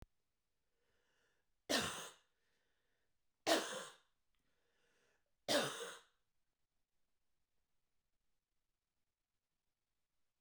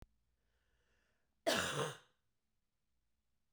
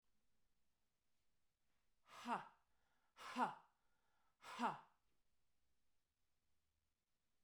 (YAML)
three_cough_length: 10.4 s
three_cough_amplitude: 3026
three_cough_signal_mean_std_ratio: 0.24
cough_length: 3.5 s
cough_amplitude: 2473
cough_signal_mean_std_ratio: 0.29
exhalation_length: 7.4 s
exhalation_amplitude: 1032
exhalation_signal_mean_std_ratio: 0.27
survey_phase: beta (2021-08-13 to 2022-03-07)
age: 45-64
gender: Female
wearing_mask: 'No'
symptom_cough_any: true
smoker_status: Current smoker (1 to 10 cigarettes per day)
respiratory_condition_asthma: false
respiratory_condition_other: false
recruitment_source: REACT
submission_delay: 2 days
covid_test_result: Negative
covid_test_method: RT-qPCR
influenza_a_test_result: Negative
influenza_b_test_result: Negative